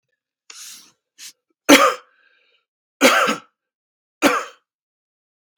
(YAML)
three_cough_length: 5.6 s
three_cough_amplitude: 32768
three_cough_signal_mean_std_ratio: 0.29
survey_phase: beta (2021-08-13 to 2022-03-07)
age: 45-64
gender: Male
wearing_mask: 'No'
symptom_cough_any: true
symptom_runny_or_blocked_nose: true
symptom_shortness_of_breath: true
symptom_onset: 4 days
smoker_status: Never smoked
respiratory_condition_asthma: false
respiratory_condition_other: false
recruitment_source: Test and Trace
submission_delay: 1 day
covid_test_result: Positive
covid_test_method: RT-qPCR
covid_ct_value: 23.4
covid_ct_gene: N gene